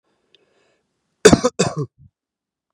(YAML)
cough_length: 2.7 s
cough_amplitude: 32768
cough_signal_mean_std_ratio: 0.24
survey_phase: beta (2021-08-13 to 2022-03-07)
age: 18-44
gender: Male
wearing_mask: 'No'
symptom_none: true
smoker_status: Never smoked
respiratory_condition_asthma: false
respiratory_condition_other: false
recruitment_source: REACT
submission_delay: 0 days
covid_test_result: Negative
covid_test_method: RT-qPCR
influenza_a_test_result: Negative
influenza_b_test_result: Negative